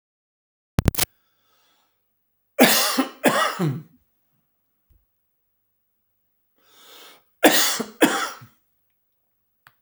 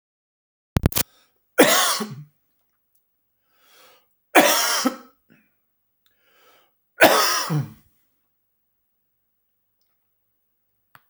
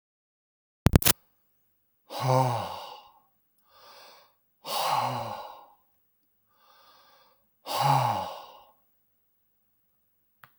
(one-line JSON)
{"cough_length": "9.8 s", "cough_amplitude": 32767, "cough_signal_mean_std_ratio": 0.31, "three_cough_length": "11.1 s", "three_cough_amplitude": 32768, "three_cough_signal_mean_std_ratio": 0.3, "exhalation_length": "10.6 s", "exhalation_amplitude": 32768, "exhalation_signal_mean_std_ratio": 0.31, "survey_phase": "alpha (2021-03-01 to 2021-08-12)", "age": "65+", "gender": "Male", "wearing_mask": "No", "symptom_none": true, "smoker_status": "Ex-smoker", "respiratory_condition_asthma": false, "respiratory_condition_other": false, "recruitment_source": "REACT", "submission_delay": "3 days", "covid_test_result": "Negative", "covid_test_method": "RT-qPCR"}